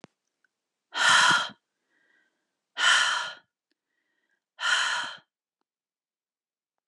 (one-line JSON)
{"exhalation_length": "6.9 s", "exhalation_amplitude": 13225, "exhalation_signal_mean_std_ratio": 0.37, "survey_phase": "alpha (2021-03-01 to 2021-08-12)", "age": "45-64", "gender": "Female", "wearing_mask": "No", "symptom_cough_any": true, "symptom_fatigue": true, "symptom_fever_high_temperature": true, "symptom_headache": true, "symptom_onset": "3 days", "smoker_status": "Never smoked", "respiratory_condition_asthma": false, "respiratory_condition_other": false, "recruitment_source": "Test and Trace", "submission_delay": "2 days", "covid_test_result": "Positive", "covid_test_method": "RT-qPCR", "covid_ct_value": 17.2, "covid_ct_gene": "ORF1ab gene", "covid_ct_mean": 18.6, "covid_viral_load": "800000 copies/ml", "covid_viral_load_category": "Low viral load (10K-1M copies/ml)"}